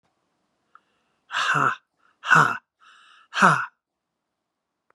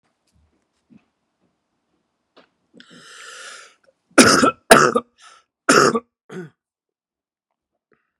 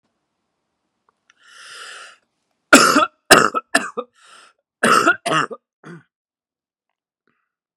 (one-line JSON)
{"exhalation_length": "4.9 s", "exhalation_amplitude": 28773, "exhalation_signal_mean_std_ratio": 0.33, "three_cough_length": "8.2 s", "three_cough_amplitude": 32768, "three_cough_signal_mean_std_ratio": 0.26, "cough_length": "7.8 s", "cough_amplitude": 32768, "cough_signal_mean_std_ratio": 0.3, "survey_phase": "beta (2021-08-13 to 2022-03-07)", "age": "45-64", "gender": "Male", "wearing_mask": "No", "symptom_cough_any": true, "symptom_runny_or_blocked_nose": true, "symptom_diarrhoea": true, "symptom_fatigue": true, "symptom_fever_high_temperature": true, "symptom_headache": true, "symptom_change_to_sense_of_smell_or_taste": true, "smoker_status": "Never smoked", "respiratory_condition_asthma": false, "respiratory_condition_other": false, "recruitment_source": "Test and Trace", "submission_delay": "1 day", "covid_test_result": "Positive", "covid_test_method": "RT-qPCR", "covid_ct_value": 20.0, "covid_ct_gene": "N gene", "covid_ct_mean": 20.5, "covid_viral_load": "190000 copies/ml", "covid_viral_load_category": "Low viral load (10K-1M copies/ml)"}